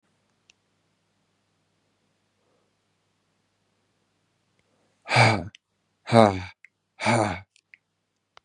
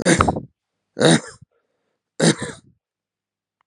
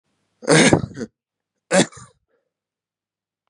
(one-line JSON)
{"exhalation_length": "8.4 s", "exhalation_amplitude": 31645, "exhalation_signal_mean_std_ratio": 0.23, "three_cough_length": "3.7 s", "three_cough_amplitude": 32768, "three_cough_signal_mean_std_ratio": 0.35, "cough_length": "3.5 s", "cough_amplitude": 32689, "cough_signal_mean_std_ratio": 0.3, "survey_phase": "beta (2021-08-13 to 2022-03-07)", "age": "18-44", "gender": "Male", "wearing_mask": "Yes", "symptom_cough_any": true, "symptom_runny_or_blocked_nose": true, "symptom_sore_throat": true, "symptom_fatigue": true, "symptom_headache": true, "symptom_onset": "5 days", "smoker_status": "Current smoker (11 or more cigarettes per day)", "respiratory_condition_asthma": false, "respiratory_condition_other": false, "recruitment_source": "Test and Trace", "submission_delay": "1 day", "covid_test_result": "Positive", "covid_test_method": "RT-qPCR", "covid_ct_value": 15.4, "covid_ct_gene": "ORF1ab gene"}